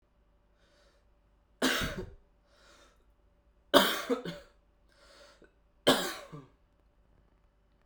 {"three_cough_length": "7.9 s", "three_cough_amplitude": 20925, "three_cough_signal_mean_std_ratio": 0.28, "survey_phase": "beta (2021-08-13 to 2022-03-07)", "age": "18-44", "gender": "Male", "wearing_mask": "No", "symptom_none": true, "smoker_status": "Never smoked", "respiratory_condition_asthma": false, "respiratory_condition_other": false, "recruitment_source": "REACT", "submission_delay": "2 days", "covid_test_result": "Negative", "covid_test_method": "RT-qPCR"}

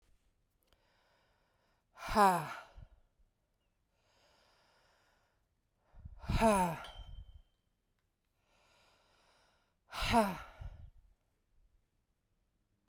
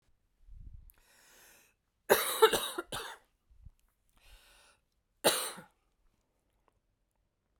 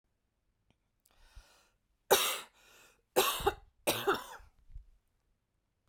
{"exhalation_length": "12.9 s", "exhalation_amplitude": 6226, "exhalation_signal_mean_std_ratio": 0.27, "cough_length": "7.6 s", "cough_amplitude": 12416, "cough_signal_mean_std_ratio": 0.25, "three_cough_length": "5.9 s", "three_cough_amplitude": 11154, "three_cough_signal_mean_std_ratio": 0.31, "survey_phase": "alpha (2021-03-01 to 2021-08-12)", "age": "45-64", "gender": "Female", "wearing_mask": "No", "symptom_cough_any": true, "symptom_fatigue": true, "symptom_change_to_sense_of_smell_or_taste": true, "symptom_onset": "8 days", "smoker_status": "Never smoked", "respiratory_condition_asthma": false, "respiratory_condition_other": false, "recruitment_source": "Test and Trace", "submission_delay": "2 days", "covid_test_result": "Positive", "covid_test_method": "RT-qPCR"}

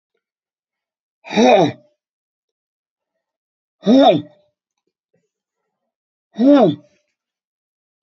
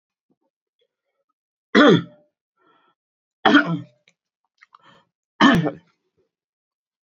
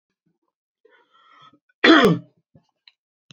{"exhalation_length": "8.0 s", "exhalation_amplitude": 28832, "exhalation_signal_mean_std_ratio": 0.3, "three_cough_length": "7.2 s", "three_cough_amplitude": 28417, "three_cough_signal_mean_std_ratio": 0.27, "cough_length": "3.3 s", "cough_amplitude": 32246, "cough_signal_mean_std_ratio": 0.26, "survey_phase": "beta (2021-08-13 to 2022-03-07)", "age": "65+", "gender": "Male", "wearing_mask": "No", "symptom_cough_any": true, "symptom_sore_throat": true, "symptom_fatigue": true, "symptom_onset": "4 days", "smoker_status": "Never smoked", "respiratory_condition_asthma": false, "respiratory_condition_other": false, "recruitment_source": "Test and Trace", "submission_delay": "2 days", "covid_test_result": "Positive", "covid_test_method": "RT-qPCR", "covid_ct_value": 14.2, "covid_ct_gene": "ORF1ab gene", "covid_ct_mean": 14.7, "covid_viral_load": "15000000 copies/ml", "covid_viral_load_category": "High viral load (>1M copies/ml)"}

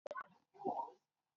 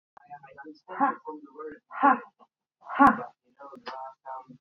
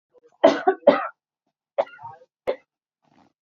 {"cough_length": "1.4 s", "cough_amplitude": 1460, "cough_signal_mean_std_ratio": 0.45, "exhalation_length": "4.6 s", "exhalation_amplitude": 16848, "exhalation_signal_mean_std_ratio": 0.34, "three_cough_length": "3.4 s", "three_cough_amplitude": 26723, "three_cough_signal_mean_std_ratio": 0.28, "survey_phase": "beta (2021-08-13 to 2022-03-07)", "age": "45-64", "gender": "Female", "wearing_mask": "No", "symptom_cough_any": true, "symptom_runny_or_blocked_nose": true, "symptom_other": true, "symptom_onset": "12 days", "smoker_status": "Ex-smoker", "respiratory_condition_asthma": false, "respiratory_condition_other": false, "recruitment_source": "REACT", "submission_delay": "1 day", "covid_test_result": "Negative", "covid_test_method": "RT-qPCR", "influenza_a_test_result": "Negative", "influenza_b_test_result": "Negative"}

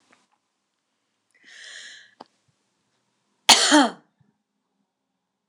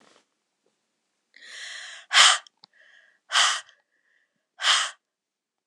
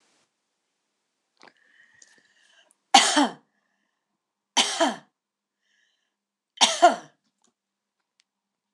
{"cough_length": "5.5 s", "cough_amplitude": 26028, "cough_signal_mean_std_ratio": 0.21, "exhalation_length": "5.7 s", "exhalation_amplitude": 26027, "exhalation_signal_mean_std_ratio": 0.3, "three_cough_length": "8.7 s", "three_cough_amplitude": 26023, "three_cough_signal_mean_std_ratio": 0.24, "survey_phase": "beta (2021-08-13 to 2022-03-07)", "age": "65+", "gender": "Female", "wearing_mask": "No", "symptom_shortness_of_breath": true, "symptom_onset": "13 days", "smoker_status": "Prefer not to say", "respiratory_condition_asthma": false, "respiratory_condition_other": false, "recruitment_source": "REACT", "submission_delay": "3 days", "covid_test_result": "Negative", "covid_test_method": "RT-qPCR", "influenza_a_test_result": "Negative", "influenza_b_test_result": "Negative"}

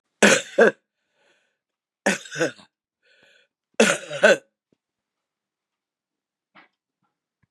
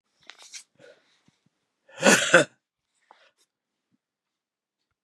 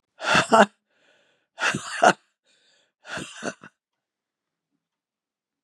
{"three_cough_length": "7.5 s", "three_cough_amplitude": 32767, "three_cough_signal_mean_std_ratio": 0.26, "cough_length": "5.0 s", "cough_amplitude": 30288, "cough_signal_mean_std_ratio": 0.21, "exhalation_length": "5.6 s", "exhalation_amplitude": 32034, "exhalation_signal_mean_std_ratio": 0.27, "survey_phase": "beta (2021-08-13 to 2022-03-07)", "age": "65+", "gender": "Female", "wearing_mask": "No", "symptom_cough_any": true, "symptom_runny_or_blocked_nose": true, "symptom_shortness_of_breath": true, "symptom_sore_throat": true, "symptom_fatigue": true, "smoker_status": "Ex-smoker", "respiratory_condition_asthma": false, "respiratory_condition_other": false, "recruitment_source": "Test and Trace", "submission_delay": "1 day", "covid_test_result": "Positive", "covid_test_method": "LFT"}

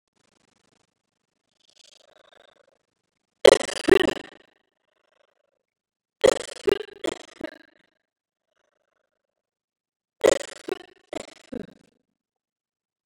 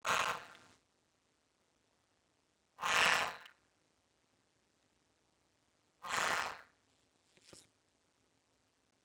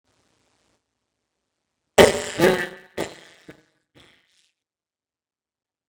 {"three_cough_length": "13.1 s", "three_cough_amplitude": 29628, "three_cough_signal_mean_std_ratio": 0.17, "exhalation_length": "9.0 s", "exhalation_amplitude": 5026, "exhalation_signal_mean_std_ratio": 0.23, "cough_length": "5.9 s", "cough_amplitude": 32585, "cough_signal_mean_std_ratio": 0.17, "survey_phase": "beta (2021-08-13 to 2022-03-07)", "age": "65+", "gender": "Female", "wearing_mask": "No", "symptom_none": true, "smoker_status": "Ex-smoker", "respiratory_condition_asthma": false, "respiratory_condition_other": false, "recruitment_source": "REACT", "submission_delay": "3 days", "covid_test_result": "Negative", "covid_test_method": "RT-qPCR", "influenza_a_test_result": "Negative", "influenza_b_test_result": "Negative"}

